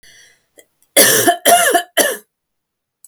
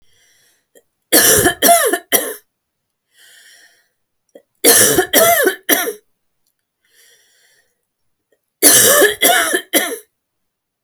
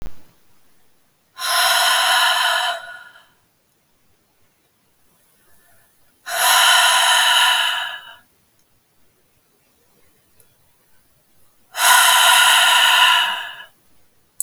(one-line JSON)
{"cough_length": "3.1 s", "cough_amplitude": 32768, "cough_signal_mean_std_ratio": 0.46, "three_cough_length": "10.8 s", "three_cough_amplitude": 32768, "three_cough_signal_mean_std_ratio": 0.43, "exhalation_length": "14.4 s", "exhalation_amplitude": 32768, "exhalation_signal_mean_std_ratio": 0.5, "survey_phase": "alpha (2021-03-01 to 2021-08-12)", "age": "45-64", "gender": "Female", "wearing_mask": "No", "symptom_none": true, "smoker_status": "Never smoked", "respiratory_condition_asthma": false, "respiratory_condition_other": false, "recruitment_source": "REACT", "submission_delay": "1 day", "covid_test_result": "Negative", "covid_test_method": "RT-qPCR"}